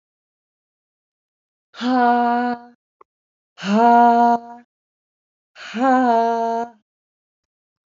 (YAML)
exhalation_length: 7.9 s
exhalation_amplitude: 24671
exhalation_signal_mean_std_ratio: 0.45
survey_phase: alpha (2021-03-01 to 2021-08-12)
age: 45-64
gender: Female
wearing_mask: 'No'
symptom_none: true
smoker_status: Current smoker (1 to 10 cigarettes per day)
respiratory_condition_asthma: false
respiratory_condition_other: false
recruitment_source: REACT
submission_delay: 1 day
covid_test_result: Negative
covid_test_method: RT-qPCR